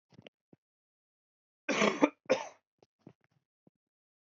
{
  "cough_length": "4.3 s",
  "cough_amplitude": 13432,
  "cough_signal_mean_std_ratio": 0.24,
  "survey_phase": "beta (2021-08-13 to 2022-03-07)",
  "age": "18-44",
  "gender": "Male",
  "wearing_mask": "No",
  "symptom_cough_any": true,
  "symptom_new_continuous_cough": true,
  "symptom_runny_or_blocked_nose": true,
  "symptom_sore_throat": true,
  "symptom_fatigue": true,
  "symptom_change_to_sense_of_smell_or_taste": true,
  "symptom_onset": "4 days",
  "smoker_status": "Current smoker (e-cigarettes or vapes only)",
  "respiratory_condition_asthma": false,
  "respiratory_condition_other": false,
  "recruitment_source": "Test and Trace",
  "submission_delay": "1 day",
  "covid_test_result": "Positive",
  "covid_test_method": "ePCR"
}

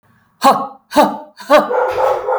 {
  "exhalation_length": "2.4 s",
  "exhalation_amplitude": 32768,
  "exhalation_signal_mean_std_ratio": 0.63,
  "survey_phase": "alpha (2021-03-01 to 2021-08-12)",
  "age": "18-44",
  "gender": "Female",
  "wearing_mask": "No",
  "symptom_none": true,
  "smoker_status": "Ex-smoker",
  "respiratory_condition_asthma": false,
  "respiratory_condition_other": false,
  "recruitment_source": "REACT",
  "submission_delay": "1 day",
  "covid_test_result": "Negative",
  "covid_test_method": "RT-qPCR"
}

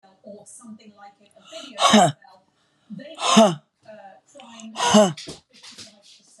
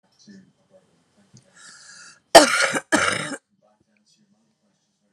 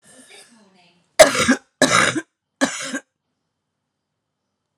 {
  "exhalation_length": "6.4 s",
  "exhalation_amplitude": 27021,
  "exhalation_signal_mean_std_ratio": 0.35,
  "cough_length": "5.1 s",
  "cough_amplitude": 32768,
  "cough_signal_mean_std_ratio": 0.25,
  "three_cough_length": "4.8 s",
  "three_cough_amplitude": 32768,
  "three_cough_signal_mean_std_ratio": 0.31,
  "survey_phase": "alpha (2021-03-01 to 2021-08-12)",
  "age": "45-64",
  "gender": "Female",
  "wearing_mask": "No",
  "symptom_cough_any": true,
  "symptom_new_continuous_cough": true,
  "symptom_fatigue": true,
  "symptom_onset": "6 days",
  "smoker_status": "Ex-smoker",
  "respiratory_condition_asthma": false,
  "respiratory_condition_other": false,
  "recruitment_source": "Test and Trace",
  "submission_delay": "1 day",
  "covid_test_result": "Positive",
  "covid_test_method": "RT-qPCR"
}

